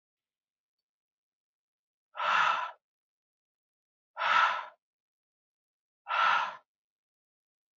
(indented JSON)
{
  "exhalation_length": "7.8 s",
  "exhalation_amplitude": 7064,
  "exhalation_signal_mean_std_ratio": 0.33,
  "survey_phase": "beta (2021-08-13 to 2022-03-07)",
  "age": "65+",
  "gender": "Male",
  "wearing_mask": "No",
  "symptom_none": true,
  "smoker_status": "Never smoked",
  "respiratory_condition_asthma": false,
  "respiratory_condition_other": false,
  "recruitment_source": "REACT",
  "submission_delay": "3 days",
  "covid_test_result": "Negative",
  "covid_test_method": "RT-qPCR"
}